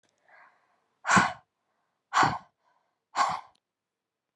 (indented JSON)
{
  "exhalation_length": "4.4 s",
  "exhalation_amplitude": 14197,
  "exhalation_signal_mean_std_ratio": 0.3,
  "survey_phase": "beta (2021-08-13 to 2022-03-07)",
  "age": "18-44",
  "gender": "Female",
  "wearing_mask": "No",
  "symptom_cough_any": true,
  "symptom_sore_throat": true,
  "symptom_abdominal_pain": true,
  "symptom_fatigue": true,
  "symptom_headache": true,
  "symptom_change_to_sense_of_smell_or_taste": true,
  "symptom_loss_of_taste": true,
  "symptom_other": true,
  "symptom_onset": "8 days",
  "smoker_status": "Ex-smoker",
  "respiratory_condition_asthma": false,
  "respiratory_condition_other": false,
  "recruitment_source": "Test and Trace",
  "submission_delay": "2 days",
  "covid_test_result": "Positive",
  "covid_test_method": "RT-qPCR"
}